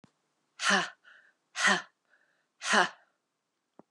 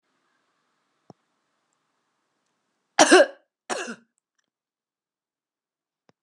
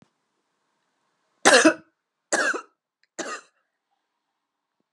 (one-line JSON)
{"exhalation_length": "3.9 s", "exhalation_amplitude": 10036, "exhalation_signal_mean_std_ratio": 0.34, "cough_length": "6.2 s", "cough_amplitude": 27619, "cough_signal_mean_std_ratio": 0.17, "three_cough_length": "4.9 s", "three_cough_amplitude": 32733, "three_cough_signal_mean_std_ratio": 0.25, "survey_phase": "beta (2021-08-13 to 2022-03-07)", "age": "45-64", "gender": "Female", "wearing_mask": "No", "symptom_cough_any": true, "symptom_runny_or_blocked_nose": true, "symptom_fatigue": true, "symptom_headache": true, "symptom_onset": "6 days", "smoker_status": "Never smoked", "respiratory_condition_asthma": false, "respiratory_condition_other": false, "recruitment_source": "Test and Trace", "submission_delay": "2 days", "covid_test_result": "Positive", "covid_test_method": "ePCR"}